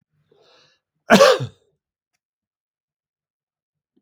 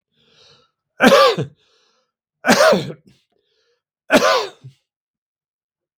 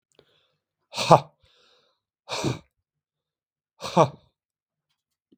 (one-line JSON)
{"cough_length": "4.0 s", "cough_amplitude": 32766, "cough_signal_mean_std_ratio": 0.22, "three_cough_length": "6.0 s", "three_cough_amplitude": 32766, "three_cough_signal_mean_std_ratio": 0.35, "exhalation_length": "5.4 s", "exhalation_amplitude": 32766, "exhalation_signal_mean_std_ratio": 0.2, "survey_phase": "beta (2021-08-13 to 2022-03-07)", "age": "65+", "gender": "Male", "wearing_mask": "No", "symptom_none": true, "smoker_status": "Ex-smoker", "respiratory_condition_asthma": false, "respiratory_condition_other": false, "recruitment_source": "REACT", "submission_delay": "1 day", "covid_test_result": "Negative", "covid_test_method": "RT-qPCR"}